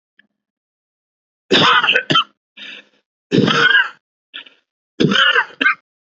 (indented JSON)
{
  "three_cough_length": "6.1 s",
  "three_cough_amplitude": 30080,
  "three_cough_signal_mean_std_ratio": 0.45,
  "survey_phase": "beta (2021-08-13 to 2022-03-07)",
  "age": "18-44",
  "gender": "Male",
  "wearing_mask": "No",
  "symptom_none": true,
  "smoker_status": "Never smoked",
  "respiratory_condition_asthma": false,
  "respiratory_condition_other": false,
  "recruitment_source": "REACT",
  "submission_delay": "1 day",
  "covid_test_result": "Negative",
  "covid_test_method": "RT-qPCR"
}